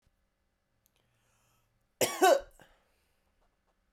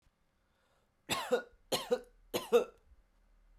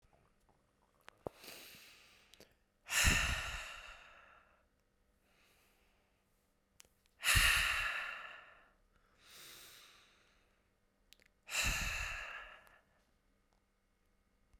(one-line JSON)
{"cough_length": "3.9 s", "cough_amplitude": 9345, "cough_signal_mean_std_ratio": 0.22, "three_cough_length": "3.6 s", "three_cough_amplitude": 5778, "three_cough_signal_mean_std_ratio": 0.33, "exhalation_length": "14.6 s", "exhalation_amplitude": 4936, "exhalation_signal_mean_std_ratio": 0.34, "survey_phase": "beta (2021-08-13 to 2022-03-07)", "age": "18-44", "gender": "Female", "wearing_mask": "No", "symptom_none": true, "smoker_status": "Ex-smoker", "respiratory_condition_asthma": true, "respiratory_condition_other": false, "recruitment_source": "REACT", "submission_delay": "1 day", "covid_test_result": "Negative", "covid_test_method": "RT-qPCR"}